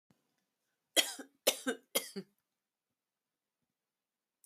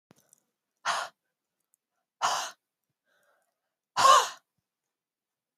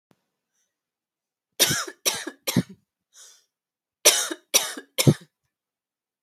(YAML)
three_cough_length: 4.5 s
three_cough_amplitude: 9008
three_cough_signal_mean_std_ratio: 0.22
exhalation_length: 5.6 s
exhalation_amplitude: 15544
exhalation_signal_mean_std_ratio: 0.25
cough_length: 6.2 s
cough_amplitude: 30490
cough_signal_mean_std_ratio: 0.29
survey_phase: alpha (2021-03-01 to 2021-08-12)
age: 18-44
gender: Female
wearing_mask: 'No'
symptom_none: true
smoker_status: Never smoked
respiratory_condition_asthma: false
respiratory_condition_other: false
recruitment_source: REACT
submission_delay: 2 days
covid_test_result: Negative
covid_test_method: RT-qPCR